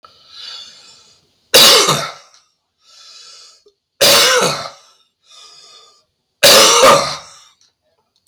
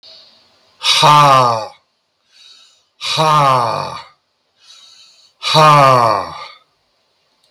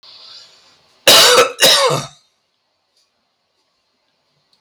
{
  "three_cough_length": "8.3 s",
  "three_cough_amplitude": 32768,
  "three_cough_signal_mean_std_ratio": 0.42,
  "exhalation_length": "7.5 s",
  "exhalation_amplitude": 32768,
  "exhalation_signal_mean_std_ratio": 0.48,
  "cough_length": "4.6 s",
  "cough_amplitude": 32768,
  "cough_signal_mean_std_ratio": 0.37,
  "survey_phase": "beta (2021-08-13 to 2022-03-07)",
  "age": "65+",
  "gender": "Male",
  "wearing_mask": "No",
  "symptom_change_to_sense_of_smell_or_taste": true,
  "smoker_status": "Ex-smoker",
  "respiratory_condition_asthma": false,
  "respiratory_condition_other": false,
  "recruitment_source": "REACT",
  "submission_delay": "3 days",
  "covid_test_result": "Negative",
  "covid_test_method": "RT-qPCR",
  "influenza_a_test_result": "Negative",
  "influenza_b_test_result": "Negative"
}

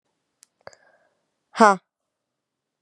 {
  "exhalation_length": "2.8 s",
  "exhalation_amplitude": 32136,
  "exhalation_signal_mean_std_ratio": 0.16,
  "survey_phase": "beta (2021-08-13 to 2022-03-07)",
  "age": "18-44",
  "gender": "Female",
  "wearing_mask": "No",
  "symptom_cough_any": true,
  "symptom_new_continuous_cough": true,
  "symptom_runny_or_blocked_nose": true,
  "symptom_shortness_of_breath": true,
  "symptom_sore_throat": true,
  "symptom_fatigue": true,
  "symptom_fever_high_temperature": true,
  "symptom_change_to_sense_of_smell_or_taste": true,
  "symptom_loss_of_taste": true,
  "symptom_onset": "3 days",
  "smoker_status": "Current smoker (1 to 10 cigarettes per day)",
  "respiratory_condition_asthma": false,
  "respiratory_condition_other": false,
  "recruitment_source": "Test and Trace",
  "submission_delay": "1 day",
  "covid_test_result": "Positive",
  "covid_test_method": "RT-qPCR",
  "covid_ct_value": 24.8,
  "covid_ct_gene": "ORF1ab gene"
}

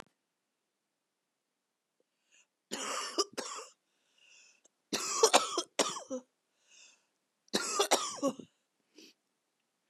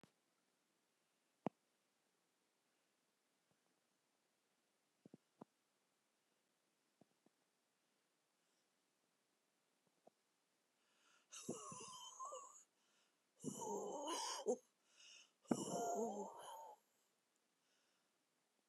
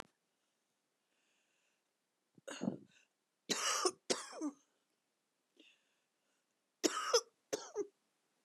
{
  "three_cough_length": "9.9 s",
  "three_cough_amplitude": 14308,
  "three_cough_signal_mean_std_ratio": 0.32,
  "exhalation_length": "18.7 s",
  "exhalation_amplitude": 2569,
  "exhalation_signal_mean_std_ratio": 0.32,
  "cough_length": "8.4 s",
  "cough_amplitude": 5369,
  "cough_signal_mean_std_ratio": 0.3,
  "survey_phase": "beta (2021-08-13 to 2022-03-07)",
  "age": "65+",
  "gender": "Female",
  "wearing_mask": "No",
  "symptom_cough_any": true,
  "symptom_new_continuous_cough": true,
  "symptom_runny_or_blocked_nose": true,
  "symptom_shortness_of_breath": true,
  "symptom_sore_throat": true,
  "symptom_abdominal_pain": true,
  "symptom_diarrhoea": true,
  "symptom_fever_high_temperature": true,
  "symptom_onset": "9 days",
  "smoker_status": "Never smoked",
  "respiratory_condition_asthma": true,
  "respiratory_condition_other": false,
  "recruitment_source": "Test and Trace",
  "submission_delay": "2 days",
  "covid_test_result": "Positive",
  "covid_test_method": "RT-qPCR",
  "covid_ct_value": 30.8,
  "covid_ct_gene": "ORF1ab gene",
  "covid_ct_mean": 31.3,
  "covid_viral_load": "55 copies/ml",
  "covid_viral_load_category": "Minimal viral load (< 10K copies/ml)"
}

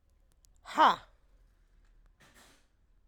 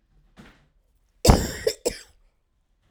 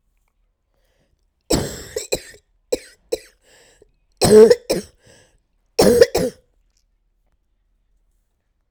{
  "exhalation_length": "3.1 s",
  "exhalation_amplitude": 10183,
  "exhalation_signal_mean_std_ratio": 0.22,
  "cough_length": "2.9 s",
  "cough_amplitude": 32767,
  "cough_signal_mean_std_ratio": 0.26,
  "three_cough_length": "8.7 s",
  "three_cough_amplitude": 32768,
  "three_cough_signal_mean_std_ratio": 0.27,
  "survey_phase": "alpha (2021-03-01 to 2021-08-12)",
  "age": "18-44",
  "gender": "Female",
  "wearing_mask": "No",
  "symptom_cough_any": true,
  "symptom_shortness_of_breath": true,
  "symptom_abdominal_pain": true,
  "symptom_diarrhoea": true,
  "symptom_fatigue": true,
  "symptom_fever_high_temperature": true,
  "symptom_headache": true,
  "symptom_change_to_sense_of_smell_or_taste": true,
  "symptom_loss_of_taste": true,
  "symptom_onset": "3 days",
  "smoker_status": "Current smoker (11 or more cigarettes per day)",
  "respiratory_condition_asthma": true,
  "respiratory_condition_other": false,
  "recruitment_source": "Test and Trace",
  "submission_delay": "1 day",
  "covid_test_result": "Positive",
  "covid_test_method": "RT-qPCR"
}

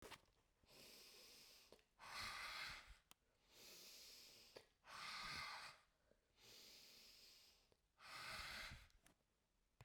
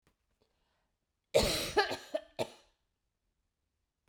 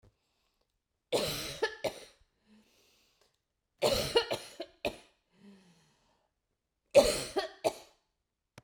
{
  "exhalation_length": "9.8 s",
  "exhalation_amplitude": 349,
  "exhalation_signal_mean_std_ratio": 0.63,
  "cough_length": "4.1 s",
  "cough_amplitude": 6762,
  "cough_signal_mean_std_ratio": 0.3,
  "three_cough_length": "8.6 s",
  "three_cough_amplitude": 12859,
  "three_cough_signal_mean_std_ratio": 0.31,
  "survey_phase": "beta (2021-08-13 to 2022-03-07)",
  "age": "45-64",
  "gender": "Female",
  "wearing_mask": "No",
  "symptom_none": true,
  "symptom_onset": "3 days",
  "smoker_status": "Never smoked",
  "respiratory_condition_asthma": false,
  "respiratory_condition_other": false,
  "recruitment_source": "REACT",
  "submission_delay": "1 day",
  "covid_test_result": "Negative",
  "covid_test_method": "RT-qPCR"
}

